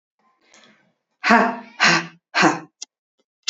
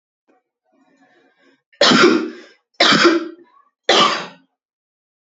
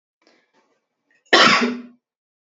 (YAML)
exhalation_length: 3.5 s
exhalation_amplitude: 32768
exhalation_signal_mean_std_ratio: 0.38
three_cough_length: 5.2 s
three_cough_amplitude: 30802
three_cough_signal_mean_std_ratio: 0.41
cough_length: 2.6 s
cough_amplitude: 29078
cough_signal_mean_std_ratio: 0.32
survey_phase: beta (2021-08-13 to 2022-03-07)
age: 18-44
gender: Female
wearing_mask: 'No'
symptom_none: true
smoker_status: Ex-smoker
respiratory_condition_asthma: false
respiratory_condition_other: false
recruitment_source: REACT
submission_delay: 3 days
covid_test_result: Negative
covid_test_method: RT-qPCR
influenza_a_test_result: Negative
influenza_b_test_result: Negative